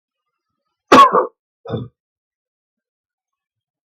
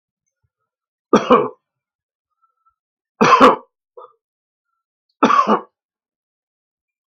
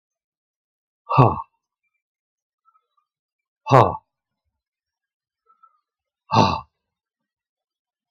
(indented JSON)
{
  "cough_length": "3.8 s",
  "cough_amplitude": 32768,
  "cough_signal_mean_std_ratio": 0.24,
  "three_cough_length": "7.1 s",
  "three_cough_amplitude": 32768,
  "three_cough_signal_mean_std_ratio": 0.28,
  "exhalation_length": "8.1 s",
  "exhalation_amplitude": 32768,
  "exhalation_signal_mean_std_ratio": 0.21,
  "survey_phase": "beta (2021-08-13 to 2022-03-07)",
  "age": "65+",
  "gender": "Male",
  "wearing_mask": "No",
  "symptom_none": true,
  "smoker_status": "Ex-smoker",
  "respiratory_condition_asthma": false,
  "respiratory_condition_other": false,
  "recruitment_source": "REACT",
  "submission_delay": "7 days",
  "covid_test_result": "Negative",
  "covid_test_method": "RT-qPCR",
  "influenza_a_test_result": "Negative",
  "influenza_b_test_result": "Negative"
}